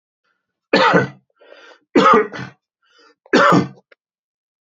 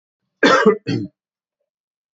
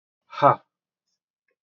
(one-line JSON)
{"three_cough_length": "4.6 s", "three_cough_amplitude": 30115, "three_cough_signal_mean_std_ratio": 0.4, "cough_length": "2.1 s", "cough_amplitude": 27722, "cough_signal_mean_std_ratio": 0.37, "exhalation_length": "1.6 s", "exhalation_amplitude": 22622, "exhalation_signal_mean_std_ratio": 0.22, "survey_phase": "beta (2021-08-13 to 2022-03-07)", "age": "45-64", "gender": "Male", "wearing_mask": "No", "symptom_none": true, "smoker_status": "Never smoked", "respiratory_condition_asthma": false, "respiratory_condition_other": false, "recruitment_source": "REACT", "submission_delay": "1 day", "covid_test_result": "Negative", "covid_test_method": "RT-qPCR", "influenza_a_test_result": "Negative", "influenza_b_test_result": "Negative"}